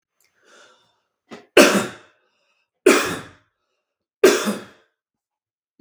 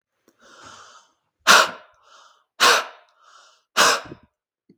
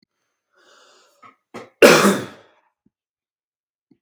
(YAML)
three_cough_length: 5.8 s
three_cough_amplitude: 32768
three_cough_signal_mean_std_ratio: 0.28
exhalation_length: 4.8 s
exhalation_amplitude: 32766
exhalation_signal_mean_std_ratio: 0.31
cough_length: 4.0 s
cough_amplitude: 32768
cough_signal_mean_std_ratio: 0.24
survey_phase: beta (2021-08-13 to 2022-03-07)
age: 18-44
gender: Male
wearing_mask: 'No'
symptom_runny_or_blocked_nose: true
symptom_sore_throat: true
symptom_other: true
symptom_onset: 2 days
smoker_status: Never smoked
respiratory_condition_asthma: false
respiratory_condition_other: true
recruitment_source: Test and Trace
submission_delay: 0 days
covid_test_result: Positive
covid_test_method: RT-qPCR
covid_ct_value: 18.6
covid_ct_gene: ORF1ab gene
covid_ct_mean: 18.8
covid_viral_load: 660000 copies/ml
covid_viral_load_category: Low viral load (10K-1M copies/ml)